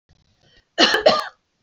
{"cough_length": "1.6 s", "cough_amplitude": 26959, "cough_signal_mean_std_ratio": 0.39, "survey_phase": "alpha (2021-03-01 to 2021-08-12)", "age": "18-44", "gender": "Female", "wearing_mask": "No", "symptom_shortness_of_breath": true, "symptom_headache": true, "smoker_status": "Ex-smoker", "respiratory_condition_asthma": false, "respiratory_condition_other": false, "recruitment_source": "REACT", "submission_delay": "1 day", "covid_test_result": "Negative", "covid_test_method": "RT-qPCR"}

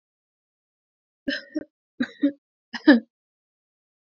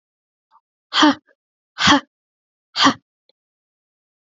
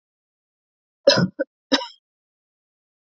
{"three_cough_length": "4.2 s", "three_cough_amplitude": 25124, "three_cough_signal_mean_std_ratio": 0.22, "exhalation_length": "4.4 s", "exhalation_amplitude": 29201, "exhalation_signal_mean_std_ratio": 0.28, "cough_length": "3.1 s", "cough_amplitude": 25465, "cough_signal_mean_std_ratio": 0.25, "survey_phase": "beta (2021-08-13 to 2022-03-07)", "age": "18-44", "gender": "Female", "wearing_mask": "No", "symptom_none": true, "smoker_status": "Never smoked", "respiratory_condition_asthma": false, "respiratory_condition_other": false, "recruitment_source": "REACT", "submission_delay": "1 day", "covid_test_result": "Negative", "covid_test_method": "RT-qPCR", "influenza_a_test_result": "Negative", "influenza_b_test_result": "Negative"}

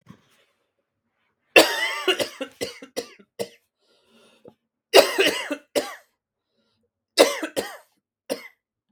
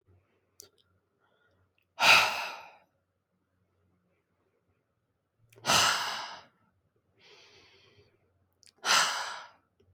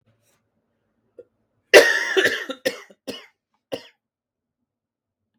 {"three_cough_length": "8.9 s", "three_cough_amplitude": 32767, "three_cough_signal_mean_std_ratio": 0.29, "exhalation_length": "9.9 s", "exhalation_amplitude": 14424, "exhalation_signal_mean_std_ratio": 0.29, "cough_length": "5.4 s", "cough_amplitude": 32768, "cough_signal_mean_std_ratio": 0.25, "survey_phase": "beta (2021-08-13 to 2022-03-07)", "age": "18-44", "gender": "Female", "wearing_mask": "No", "symptom_shortness_of_breath": true, "symptom_fatigue": true, "symptom_onset": "12 days", "smoker_status": "Never smoked", "respiratory_condition_asthma": true, "respiratory_condition_other": false, "recruitment_source": "REACT", "submission_delay": "10 days", "covid_test_result": "Negative", "covid_test_method": "RT-qPCR"}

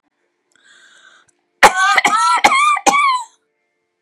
{"cough_length": "4.0 s", "cough_amplitude": 32768, "cough_signal_mean_std_ratio": 0.5, "survey_phase": "beta (2021-08-13 to 2022-03-07)", "age": "65+", "gender": "Female", "wearing_mask": "No", "symptom_none": true, "symptom_onset": "12 days", "smoker_status": "Ex-smoker", "respiratory_condition_asthma": false, "respiratory_condition_other": true, "recruitment_source": "REACT", "submission_delay": "1 day", "covid_test_result": "Negative", "covid_test_method": "RT-qPCR", "influenza_a_test_result": "Negative", "influenza_b_test_result": "Negative"}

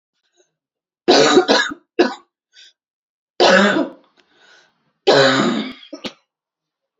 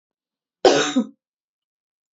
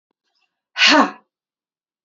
{"three_cough_length": "7.0 s", "three_cough_amplitude": 32767, "three_cough_signal_mean_std_ratio": 0.42, "cough_length": "2.1 s", "cough_amplitude": 27893, "cough_signal_mean_std_ratio": 0.3, "exhalation_length": "2.0 s", "exhalation_amplitude": 29069, "exhalation_signal_mean_std_ratio": 0.31, "survey_phase": "beta (2021-08-13 to 2022-03-07)", "age": "18-44", "gender": "Female", "wearing_mask": "No", "symptom_cough_any": true, "symptom_runny_or_blocked_nose": true, "symptom_shortness_of_breath": true, "symptom_sore_throat": true, "symptom_onset": "7 days", "smoker_status": "Never smoked", "respiratory_condition_asthma": false, "respiratory_condition_other": false, "recruitment_source": "Test and Trace", "submission_delay": "0 days", "covid_test_result": "Positive", "covid_test_method": "RT-qPCR", "covid_ct_value": 26.3, "covid_ct_gene": "ORF1ab gene", "covid_ct_mean": 27.0, "covid_viral_load": "1400 copies/ml", "covid_viral_load_category": "Minimal viral load (< 10K copies/ml)"}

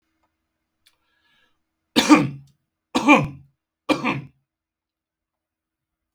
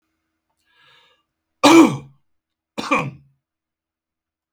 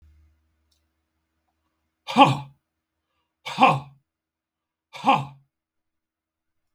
{"three_cough_length": "6.1 s", "three_cough_amplitude": 32766, "three_cough_signal_mean_std_ratio": 0.27, "cough_length": "4.5 s", "cough_amplitude": 32768, "cough_signal_mean_std_ratio": 0.25, "exhalation_length": "6.7 s", "exhalation_amplitude": 31423, "exhalation_signal_mean_std_ratio": 0.23, "survey_phase": "beta (2021-08-13 to 2022-03-07)", "age": "45-64", "gender": "Male", "wearing_mask": "No", "symptom_none": true, "smoker_status": "Current smoker (11 or more cigarettes per day)", "respiratory_condition_asthma": false, "respiratory_condition_other": false, "recruitment_source": "REACT", "submission_delay": "2 days", "covid_test_result": "Negative", "covid_test_method": "RT-qPCR", "influenza_a_test_result": "Negative", "influenza_b_test_result": "Negative"}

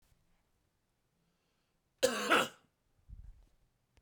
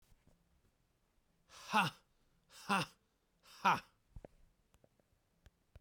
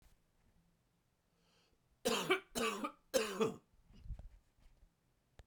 {"cough_length": "4.0 s", "cough_amplitude": 5995, "cough_signal_mean_std_ratio": 0.26, "exhalation_length": "5.8 s", "exhalation_amplitude": 4187, "exhalation_signal_mean_std_ratio": 0.25, "three_cough_length": "5.5 s", "three_cough_amplitude": 3644, "three_cough_signal_mean_std_ratio": 0.37, "survey_phase": "beta (2021-08-13 to 2022-03-07)", "age": "45-64", "gender": "Male", "wearing_mask": "No", "symptom_cough_any": true, "symptom_runny_or_blocked_nose": true, "symptom_sore_throat": true, "symptom_fatigue": true, "symptom_headache": true, "symptom_change_to_sense_of_smell_or_taste": true, "smoker_status": "Never smoked", "respiratory_condition_asthma": true, "respiratory_condition_other": false, "recruitment_source": "Test and Trace", "submission_delay": "2 days", "covid_test_result": "Positive", "covid_test_method": "RT-qPCR"}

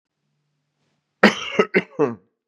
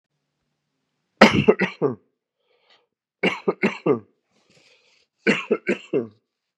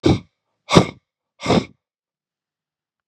{"cough_length": "2.5 s", "cough_amplitude": 32767, "cough_signal_mean_std_ratio": 0.31, "three_cough_length": "6.6 s", "three_cough_amplitude": 32768, "three_cough_signal_mean_std_ratio": 0.31, "exhalation_length": "3.1 s", "exhalation_amplitude": 32768, "exhalation_signal_mean_std_ratio": 0.29, "survey_phase": "beta (2021-08-13 to 2022-03-07)", "age": "45-64", "gender": "Male", "wearing_mask": "No", "symptom_cough_any": true, "symptom_fever_high_temperature": true, "symptom_headache": true, "symptom_other": true, "symptom_onset": "3 days", "smoker_status": "Ex-smoker", "respiratory_condition_asthma": true, "respiratory_condition_other": false, "recruitment_source": "Test and Trace", "submission_delay": "2 days", "covid_test_result": "Positive", "covid_test_method": "RT-qPCR", "covid_ct_value": 21.2, "covid_ct_gene": "N gene"}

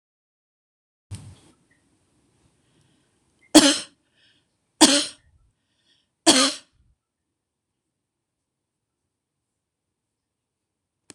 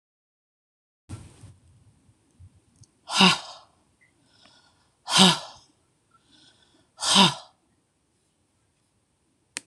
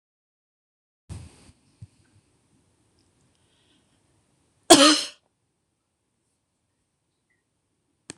{"three_cough_length": "11.1 s", "three_cough_amplitude": 26028, "three_cough_signal_mean_std_ratio": 0.19, "exhalation_length": "9.7 s", "exhalation_amplitude": 25601, "exhalation_signal_mean_std_ratio": 0.24, "cough_length": "8.2 s", "cough_amplitude": 26028, "cough_signal_mean_std_ratio": 0.16, "survey_phase": "beta (2021-08-13 to 2022-03-07)", "age": "65+", "gender": "Female", "wearing_mask": "No", "symptom_none": true, "smoker_status": "Never smoked", "respiratory_condition_asthma": false, "respiratory_condition_other": false, "recruitment_source": "REACT", "submission_delay": "1 day", "covid_test_result": "Negative", "covid_test_method": "RT-qPCR"}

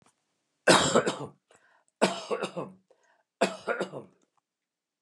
{"three_cough_length": "5.0 s", "three_cough_amplitude": 16807, "three_cough_signal_mean_std_ratio": 0.35, "survey_phase": "beta (2021-08-13 to 2022-03-07)", "age": "65+", "gender": "Male", "wearing_mask": "No", "symptom_none": true, "smoker_status": "Ex-smoker", "respiratory_condition_asthma": false, "respiratory_condition_other": true, "recruitment_source": "REACT", "submission_delay": "0 days", "covid_test_result": "Negative", "covid_test_method": "RT-qPCR", "influenza_a_test_result": "Negative", "influenza_b_test_result": "Negative"}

